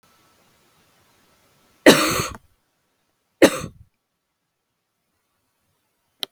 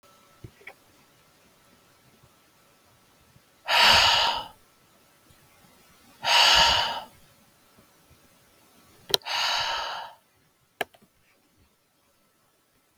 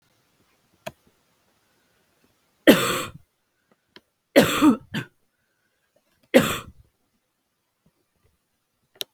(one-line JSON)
{"cough_length": "6.3 s", "cough_amplitude": 32768, "cough_signal_mean_std_ratio": 0.2, "exhalation_length": "13.0 s", "exhalation_amplitude": 32767, "exhalation_signal_mean_std_ratio": 0.33, "three_cough_length": "9.1 s", "three_cough_amplitude": 32766, "three_cough_signal_mean_std_ratio": 0.24, "survey_phase": "beta (2021-08-13 to 2022-03-07)", "age": "18-44", "gender": "Female", "wearing_mask": "No", "symptom_cough_any": true, "symptom_runny_or_blocked_nose": true, "symptom_sore_throat": true, "symptom_fatigue": true, "symptom_headache": true, "smoker_status": "Never smoked", "respiratory_condition_asthma": false, "respiratory_condition_other": false, "recruitment_source": "Test and Trace", "submission_delay": "1 day", "covid_test_result": "Positive", "covid_test_method": "RT-qPCR", "covid_ct_value": 22.5, "covid_ct_gene": "ORF1ab gene", "covid_ct_mean": 23.3, "covid_viral_load": "24000 copies/ml", "covid_viral_load_category": "Low viral load (10K-1M copies/ml)"}